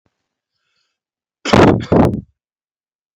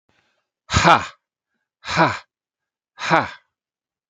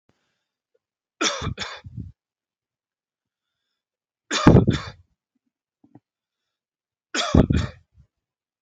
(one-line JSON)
{"cough_length": "3.2 s", "cough_amplitude": 32767, "cough_signal_mean_std_ratio": 0.35, "exhalation_length": "4.1 s", "exhalation_amplitude": 29578, "exhalation_signal_mean_std_ratio": 0.32, "three_cough_length": "8.6 s", "three_cough_amplitude": 27262, "three_cough_signal_mean_std_ratio": 0.25, "survey_phase": "beta (2021-08-13 to 2022-03-07)", "age": "45-64", "gender": "Male", "wearing_mask": "No", "symptom_none": true, "smoker_status": "Never smoked", "respiratory_condition_asthma": false, "respiratory_condition_other": false, "recruitment_source": "REACT", "submission_delay": "2 days", "covid_test_result": "Negative", "covid_test_method": "RT-qPCR"}